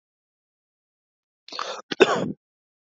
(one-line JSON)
{"cough_length": "2.9 s", "cough_amplitude": 27632, "cough_signal_mean_std_ratio": 0.25, "survey_phase": "alpha (2021-03-01 to 2021-08-12)", "age": "18-44", "gender": "Male", "wearing_mask": "No", "symptom_cough_any": true, "symptom_change_to_sense_of_smell_or_taste": true, "smoker_status": "Prefer not to say", "respiratory_condition_asthma": false, "respiratory_condition_other": false, "recruitment_source": "Test and Trace", "submission_delay": "2 days", "covid_test_result": "Positive", "covid_test_method": "LFT"}